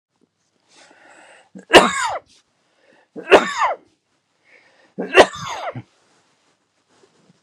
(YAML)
three_cough_length: 7.4 s
three_cough_amplitude: 32768
three_cough_signal_mean_std_ratio: 0.26
survey_phase: beta (2021-08-13 to 2022-03-07)
age: 65+
gender: Male
wearing_mask: 'No'
symptom_runny_or_blocked_nose: true
symptom_onset: 2 days
smoker_status: Never smoked
respiratory_condition_asthma: false
respiratory_condition_other: false
recruitment_source: REACT
submission_delay: 1 day
covid_test_result: Negative
covid_test_method: RT-qPCR
influenza_a_test_result: Negative
influenza_b_test_result: Negative